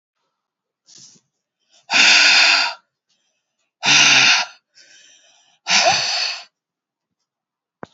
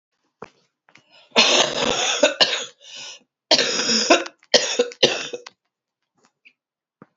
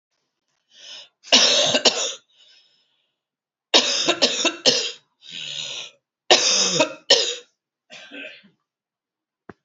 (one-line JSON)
{"exhalation_length": "7.9 s", "exhalation_amplitude": 32767, "exhalation_signal_mean_std_ratio": 0.42, "cough_length": "7.2 s", "cough_amplitude": 32435, "cough_signal_mean_std_ratio": 0.44, "three_cough_length": "9.6 s", "three_cough_amplitude": 31044, "three_cough_signal_mean_std_ratio": 0.42, "survey_phase": "alpha (2021-03-01 to 2021-08-12)", "age": "45-64", "gender": "Female", "wearing_mask": "No", "symptom_cough_any": true, "symptom_abdominal_pain": true, "symptom_diarrhoea": true, "symptom_fatigue": true, "symptom_headache": true, "smoker_status": "Ex-smoker", "respiratory_condition_asthma": false, "respiratory_condition_other": false, "recruitment_source": "Test and Trace", "submission_delay": "2 days", "covid_test_result": "Positive", "covid_test_method": "RT-qPCR", "covid_ct_value": 17.1, "covid_ct_gene": "ORF1ab gene", "covid_ct_mean": 17.4, "covid_viral_load": "2000000 copies/ml", "covid_viral_load_category": "High viral load (>1M copies/ml)"}